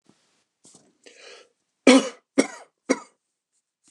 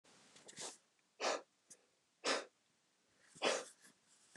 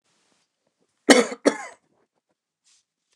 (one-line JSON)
{"three_cough_length": "3.9 s", "three_cough_amplitude": 28540, "three_cough_signal_mean_std_ratio": 0.22, "exhalation_length": "4.4 s", "exhalation_amplitude": 2389, "exhalation_signal_mean_std_ratio": 0.35, "cough_length": "3.2 s", "cough_amplitude": 29204, "cough_signal_mean_std_ratio": 0.21, "survey_phase": "beta (2021-08-13 to 2022-03-07)", "age": "45-64", "gender": "Male", "wearing_mask": "No", "symptom_none": true, "smoker_status": "Never smoked", "respiratory_condition_asthma": true, "respiratory_condition_other": false, "recruitment_source": "REACT", "submission_delay": "2 days", "covid_test_result": "Negative", "covid_test_method": "RT-qPCR", "influenza_a_test_result": "Negative", "influenza_b_test_result": "Negative"}